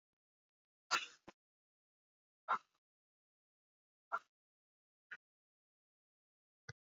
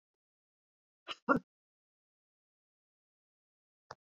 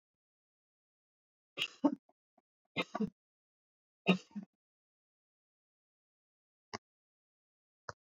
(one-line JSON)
{"exhalation_length": "6.9 s", "exhalation_amplitude": 2341, "exhalation_signal_mean_std_ratio": 0.16, "cough_length": "4.1 s", "cough_amplitude": 6096, "cough_signal_mean_std_ratio": 0.13, "three_cough_length": "8.1 s", "three_cough_amplitude": 5754, "three_cough_signal_mean_std_ratio": 0.18, "survey_phase": "beta (2021-08-13 to 2022-03-07)", "age": "65+", "gender": "Female", "wearing_mask": "No", "symptom_runny_or_blocked_nose": true, "smoker_status": "Never smoked", "respiratory_condition_asthma": false, "respiratory_condition_other": false, "recruitment_source": "REACT", "submission_delay": "1 day", "covid_test_result": "Negative", "covid_test_method": "RT-qPCR"}